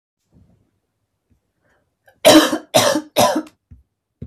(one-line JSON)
{"three_cough_length": "4.3 s", "three_cough_amplitude": 32768, "three_cough_signal_mean_std_ratio": 0.34, "survey_phase": "beta (2021-08-13 to 2022-03-07)", "age": "18-44", "gender": "Female", "wearing_mask": "No", "symptom_runny_or_blocked_nose": true, "symptom_sore_throat": true, "smoker_status": "Ex-smoker", "respiratory_condition_asthma": false, "respiratory_condition_other": false, "recruitment_source": "REACT", "submission_delay": "2 days", "covid_test_result": "Negative", "covid_test_method": "RT-qPCR", "influenza_a_test_result": "Negative", "influenza_b_test_result": "Negative"}